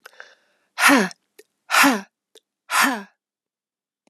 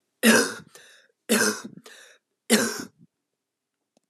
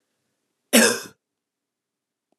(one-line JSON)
{"exhalation_length": "4.1 s", "exhalation_amplitude": 27541, "exhalation_signal_mean_std_ratio": 0.36, "three_cough_length": "4.1 s", "three_cough_amplitude": 23785, "three_cough_signal_mean_std_ratio": 0.36, "cough_length": "2.4 s", "cough_amplitude": 31033, "cough_signal_mean_std_ratio": 0.24, "survey_phase": "alpha (2021-03-01 to 2021-08-12)", "age": "18-44", "gender": "Female", "wearing_mask": "No", "symptom_fatigue": true, "symptom_headache": true, "smoker_status": "Never smoked", "respiratory_condition_asthma": false, "respiratory_condition_other": false, "recruitment_source": "Test and Trace", "submission_delay": "3 days", "covid_test_result": "Positive", "covid_test_method": "RT-qPCR", "covid_ct_value": 17.3, "covid_ct_gene": "ORF1ab gene", "covid_ct_mean": 17.5, "covid_viral_load": "1800000 copies/ml", "covid_viral_load_category": "High viral load (>1M copies/ml)"}